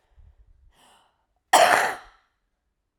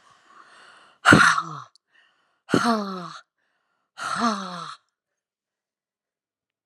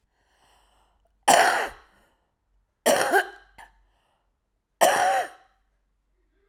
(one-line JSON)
{"cough_length": "3.0 s", "cough_amplitude": 25873, "cough_signal_mean_std_ratio": 0.29, "exhalation_length": "6.7 s", "exhalation_amplitude": 30806, "exhalation_signal_mean_std_ratio": 0.31, "three_cough_length": "6.5 s", "three_cough_amplitude": 24822, "three_cough_signal_mean_std_ratio": 0.35, "survey_phase": "alpha (2021-03-01 to 2021-08-12)", "age": "45-64", "gender": "Female", "wearing_mask": "No", "symptom_cough_any": true, "symptom_diarrhoea": true, "symptom_headache": true, "symptom_change_to_sense_of_smell_or_taste": true, "symptom_loss_of_taste": true, "symptom_onset": "2 days", "smoker_status": "Never smoked", "respiratory_condition_asthma": true, "respiratory_condition_other": false, "recruitment_source": "Test and Trace", "submission_delay": "1 day", "covid_test_result": "Positive", "covid_test_method": "RT-qPCR", "covid_ct_value": 15.3, "covid_ct_gene": "N gene", "covid_ct_mean": 15.5, "covid_viral_load": "8500000 copies/ml", "covid_viral_load_category": "High viral load (>1M copies/ml)"}